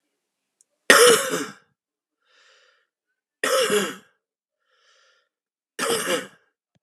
three_cough_length: 6.8 s
three_cough_amplitude: 32768
three_cough_signal_mean_std_ratio: 0.32
survey_phase: beta (2021-08-13 to 2022-03-07)
age: 45-64
gender: Male
wearing_mask: 'No'
symptom_cough_any: true
symptom_new_continuous_cough: true
symptom_shortness_of_breath: true
symptom_abdominal_pain: true
symptom_fatigue: true
symptom_fever_high_temperature: true
symptom_headache: true
symptom_change_to_sense_of_smell_or_taste: true
symptom_loss_of_taste: true
symptom_onset: 5 days
smoker_status: Ex-smoker
respiratory_condition_asthma: false
respiratory_condition_other: false
recruitment_source: Test and Trace
submission_delay: 2 days
covid_test_result: Positive
covid_test_method: RT-qPCR
covid_ct_value: 16.0
covid_ct_gene: ORF1ab gene
covid_ct_mean: 16.4
covid_viral_load: 4200000 copies/ml
covid_viral_load_category: High viral load (>1M copies/ml)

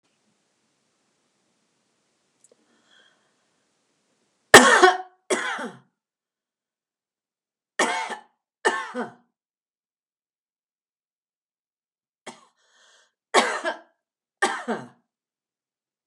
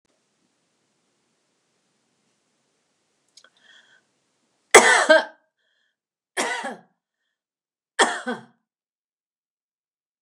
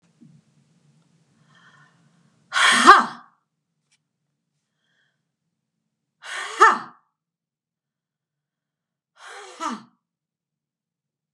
cough_length: 16.1 s
cough_amplitude: 32768
cough_signal_mean_std_ratio: 0.21
three_cough_length: 10.2 s
three_cough_amplitude: 32768
three_cough_signal_mean_std_ratio: 0.21
exhalation_length: 11.3 s
exhalation_amplitude: 32768
exhalation_signal_mean_std_ratio: 0.2
survey_phase: beta (2021-08-13 to 2022-03-07)
age: 65+
gender: Female
wearing_mask: 'No'
symptom_none: true
smoker_status: Never smoked
respiratory_condition_asthma: false
respiratory_condition_other: false
recruitment_source: REACT
submission_delay: 2 days
covid_test_result: Negative
covid_test_method: RT-qPCR
influenza_a_test_result: Negative
influenza_b_test_result: Negative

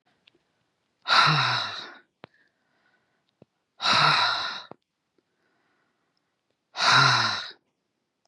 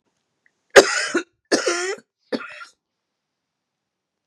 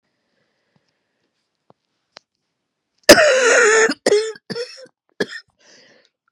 exhalation_length: 8.3 s
exhalation_amplitude: 15945
exhalation_signal_mean_std_ratio: 0.4
three_cough_length: 4.3 s
three_cough_amplitude: 32768
three_cough_signal_mean_std_ratio: 0.27
cough_length: 6.3 s
cough_amplitude: 32768
cough_signal_mean_std_ratio: 0.34
survey_phase: beta (2021-08-13 to 2022-03-07)
age: 45-64
gender: Female
wearing_mask: 'No'
symptom_cough_any: true
symptom_shortness_of_breath: true
symptom_sore_throat: true
symptom_fatigue: true
symptom_onset: 5 days
smoker_status: Current smoker (e-cigarettes or vapes only)
respiratory_condition_asthma: false
respiratory_condition_other: false
recruitment_source: Test and Trace
submission_delay: 1 day
covid_test_result: Negative
covid_test_method: RT-qPCR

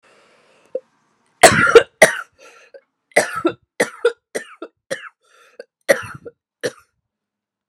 three_cough_length: 7.7 s
three_cough_amplitude: 32768
three_cough_signal_mean_std_ratio: 0.27
survey_phase: beta (2021-08-13 to 2022-03-07)
age: 45-64
gender: Female
wearing_mask: 'No'
symptom_cough_any: true
symptom_runny_or_blocked_nose: true
symptom_shortness_of_breath: true
symptom_fatigue: true
symptom_fever_high_temperature: true
symptom_headache: true
symptom_other: true
symptom_onset: 3 days
smoker_status: Ex-smoker
respiratory_condition_asthma: false
respiratory_condition_other: false
recruitment_source: Test and Trace
submission_delay: 1 day
covid_test_result: Positive
covid_test_method: RT-qPCR
covid_ct_value: 24.4
covid_ct_gene: ORF1ab gene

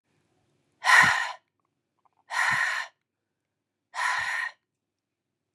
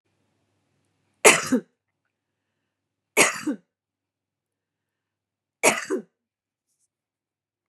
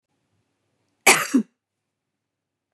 exhalation_length: 5.5 s
exhalation_amplitude: 16876
exhalation_signal_mean_std_ratio: 0.38
three_cough_length: 7.7 s
three_cough_amplitude: 32768
three_cough_signal_mean_std_ratio: 0.22
cough_length: 2.7 s
cough_amplitude: 30260
cough_signal_mean_std_ratio: 0.23
survey_phase: beta (2021-08-13 to 2022-03-07)
age: 45-64
gender: Female
wearing_mask: 'No'
symptom_cough_any: true
symptom_fatigue: true
symptom_onset: 12 days
smoker_status: Never smoked
respiratory_condition_asthma: false
respiratory_condition_other: false
recruitment_source: REACT
submission_delay: 1 day
covid_test_result: Negative
covid_test_method: RT-qPCR
influenza_a_test_result: Negative
influenza_b_test_result: Negative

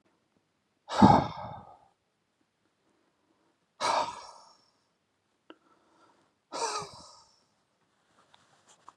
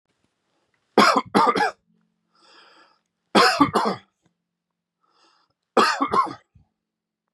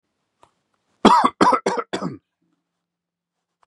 exhalation_length: 9.0 s
exhalation_amplitude: 17280
exhalation_signal_mean_std_ratio: 0.23
three_cough_length: 7.3 s
three_cough_amplitude: 26980
three_cough_signal_mean_std_ratio: 0.36
cough_length: 3.7 s
cough_amplitude: 32767
cough_signal_mean_std_ratio: 0.32
survey_phase: beta (2021-08-13 to 2022-03-07)
age: 18-44
gender: Male
wearing_mask: 'No'
symptom_none: true
smoker_status: Never smoked
respiratory_condition_asthma: false
respiratory_condition_other: false
recruitment_source: REACT
submission_delay: 2 days
covid_test_result: Negative
covid_test_method: RT-qPCR
influenza_a_test_result: Negative
influenza_b_test_result: Negative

